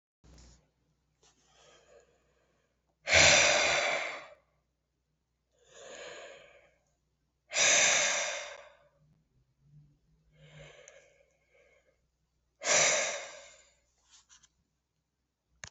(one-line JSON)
{"exhalation_length": "15.7 s", "exhalation_amplitude": 12361, "exhalation_signal_mean_std_ratio": 0.33, "survey_phase": "beta (2021-08-13 to 2022-03-07)", "age": "65+", "gender": "Male", "wearing_mask": "Yes", "symptom_other": true, "smoker_status": "Never smoked", "respiratory_condition_asthma": false, "respiratory_condition_other": false, "recruitment_source": "Test and Trace", "submission_delay": "2 days", "covid_test_result": "Positive", "covid_test_method": "RT-qPCR", "covid_ct_value": 27.5, "covid_ct_gene": "ORF1ab gene", "covid_ct_mean": 28.4, "covid_viral_load": "500 copies/ml", "covid_viral_load_category": "Minimal viral load (< 10K copies/ml)"}